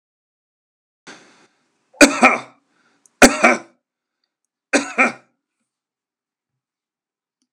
{"three_cough_length": "7.5 s", "three_cough_amplitude": 32768, "three_cough_signal_mean_std_ratio": 0.24, "survey_phase": "alpha (2021-03-01 to 2021-08-12)", "age": "65+", "gender": "Male", "wearing_mask": "No", "symptom_none": true, "smoker_status": "Ex-smoker", "respiratory_condition_asthma": false, "respiratory_condition_other": false, "recruitment_source": "REACT", "submission_delay": "1 day", "covid_test_result": "Negative", "covid_test_method": "RT-qPCR"}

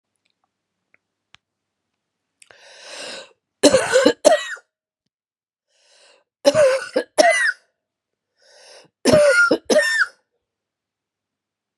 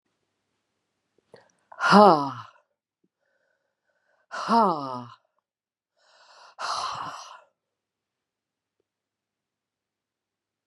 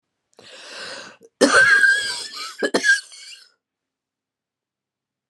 {"three_cough_length": "11.8 s", "three_cough_amplitude": 32767, "three_cough_signal_mean_std_ratio": 0.37, "exhalation_length": "10.7 s", "exhalation_amplitude": 29274, "exhalation_signal_mean_std_ratio": 0.23, "cough_length": "5.3 s", "cough_amplitude": 28868, "cough_signal_mean_std_ratio": 0.41, "survey_phase": "beta (2021-08-13 to 2022-03-07)", "age": "65+", "gender": "Female", "wearing_mask": "No", "symptom_cough_any": true, "symptom_runny_or_blocked_nose": true, "symptom_sore_throat": true, "symptom_diarrhoea": true, "symptom_fatigue": true, "symptom_headache": true, "symptom_onset": "4 days", "smoker_status": "Ex-smoker", "respiratory_condition_asthma": false, "respiratory_condition_other": false, "recruitment_source": "Test and Trace", "submission_delay": "2 days", "covid_test_result": "Positive", "covid_test_method": "RT-qPCR", "covid_ct_value": 24.9, "covid_ct_gene": "N gene"}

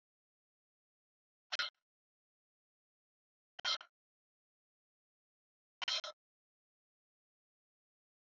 {"exhalation_length": "8.4 s", "exhalation_amplitude": 2443, "exhalation_signal_mean_std_ratio": 0.18, "survey_phase": "beta (2021-08-13 to 2022-03-07)", "age": "45-64", "gender": "Female", "wearing_mask": "No", "symptom_fatigue": true, "smoker_status": "Never smoked", "respiratory_condition_asthma": false, "respiratory_condition_other": false, "recruitment_source": "REACT", "submission_delay": "1 day", "covid_test_result": "Negative", "covid_test_method": "RT-qPCR", "influenza_a_test_result": "Negative", "influenza_b_test_result": "Negative"}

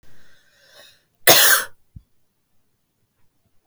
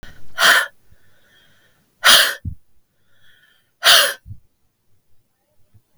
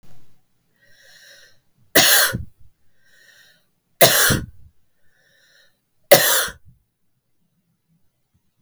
{"cough_length": "3.7 s", "cough_amplitude": 32768, "cough_signal_mean_std_ratio": 0.27, "exhalation_length": "6.0 s", "exhalation_amplitude": 32768, "exhalation_signal_mean_std_ratio": 0.34, "three_cough_length": "8.6 s", "three_cough_amplitude": 32768, "three_cough_signal_mean_std_ratio": 0.3, "survey_phase": "beta (2021-08-13 to 2022-03-07)", "age": "45-64", "gender": "Female", "wearing_mask": "No", "symptom_cough_any": true, "symptom_runny_or_blocked_nose": true, "symptom_shortness_of_breath": true, "symptom_sore_throat": true, "symptom_fatigue": true, "symptom_onset": "4 days", "smoker_status": "Prefer not to say", "respiratory_condition_asthma": true, "respiratory_condition_other": false, "recruitment_source": "Test and Trace", "submission_delay": "2 days", "covid_test_result": "Positive", "covid_test_method": "RT-qPCR", "covid_ct_value": 20.7, "covid_ct_gene": "ORF1ab gene", "covid_ct_mean": 21.0, "covid_viral_load": "130000 copies/ml", "covid_viral_load_category": "Low viral load (10K-1M copies/ml)"}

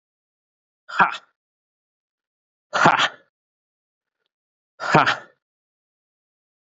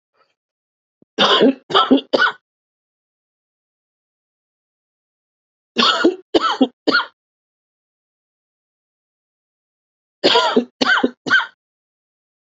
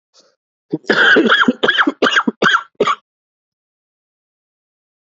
{"exhalation_length": "6.7 s", "exhalation_amplitude": 27500, "exhalation_signal_mean_std_ratio": 0.25, "three_cough_length": "12.5 s", "three_cough_amplitude": 30815, "three_cough_signal_mean_std_ratio": 0.34, "cough_length": "5.0 s", "cough_amplitude": 32739, "cough_signal_mean_std_ratio": 0.45, "survey_phase": "beta (2021-08-13 to 2022-03-07)", "age": "18-44", "gender": "Male", "wearing_mask": "Yes", "symptom_cough_any": true, "symptom_runny_or_blocked_nose": true, "symptom_sore_throat": true, "symptom_fatigue": true, "symptom_fever_high_temperature": true, "symptom_headache": true, "symptom_onset": "7 days", "smoker_status": "Never smoked", "respiratory_condition_asthma": false, "respiratory_condition_other": false, "recruitment_source": "Test and Trace", "submission_delay": "1 day", "covid_test_result": "Positive", "covid_test_method": "RT-qPCR", "covid_ct_value": 19.2, "covid_ct_gene": "ORF1ab gene", "covid_ct_mean": 19.6, "covid_viral_load": "380000 copies/ml", "covid_viral_load_category": "Low viral load (10K-1M copies/ml)"}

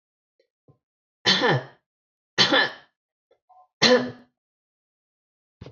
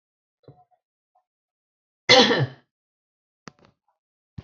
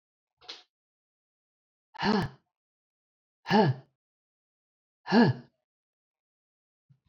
{"three_cough_length": "5.7 s", "three_cough_amplitude": 24667, "three_cough_signal_mean_std_ratio": 0.32, "cough_length": "4.4 s", "cough_amplitude": 30280, "cough_signal_mean_std_ratio": 0.22, "exhalation_length": "7.1 s", "exhalation_amplitude": 10156, "exhalation_signal_mean_std_ratio": 0.27, "survey_phase": "beta (2021-08-13 to 2022-03-07)", "age": "45-64", "gender": "Female", "wearing_mask": "No", "symptom_none": true, "smoker_status": "Never smoked", "respiratory_condition_asthma": false, "respiratory_condition_other": false, "recruitment_source": "REACT", "submission_delay": "2 days", "covid_test_result": "Negative", "covid_test_method": "RT-qPCR", "influenza_a_test_result": "Negative", "influenza_b_test_result": "Negative"}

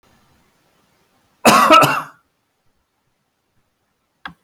{"cough_length": "4.4 s", "cough_amplitude": 32633, "cough_signal_mean_std_ratio": 0.29, "survey_phase": "beta (2021-08-13 to 2022-03-07)", "age": "65+", "gender": "Male", "wearing_mask": "No", "symptom_none": true, "smoker_status": "Ex-smoker", "respiratory_condition_asthma": false, "respiratory_condition_other": false, "recruitment_source": "REACT", "submission_delay": "5 days", "covid_test_result": "Negative", "covid_test_method": "RT-qPCR"}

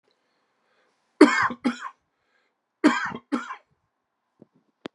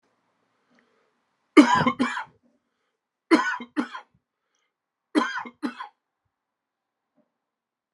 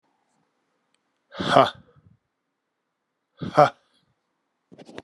{"cough_length": "4.9 s", "cough_amplitude": 29605, "cough_signal_mean_std_ratio": 0.27, "three_cough_length": "7.9 s", "three_cough_amplitude": 31576, "three_cough_signal_mean_std_ratio": 0.26, "exhalation_length": "5.0 s", "exhalation_amplitude": 28121, "exhalation_signal_mean_std_ratio": 0.21, "survey_phase": "beta (2021-08-13 to 2022-03-07)", "age": "45-64", "gender": "Male", "wearing_mask": "No", "symptom_cough_any": true, "symptom_runny_or_blocked_nose": true, "symptom_shortness_of_breath": true, "symptom_sore_throat": true, "symptom_fatigue": true, "symptom_fever_high_temperature": true, "symptom_headache": true, "smoker_status": "Ex-smoker", "respiratory_condition_asthma": false, "respiratory_condition_other": false, "recruitment_source": "Test and Trace", "submission_delay": "3 days", "covid_test_result": "Positive", "covid_test_method": "LFT"}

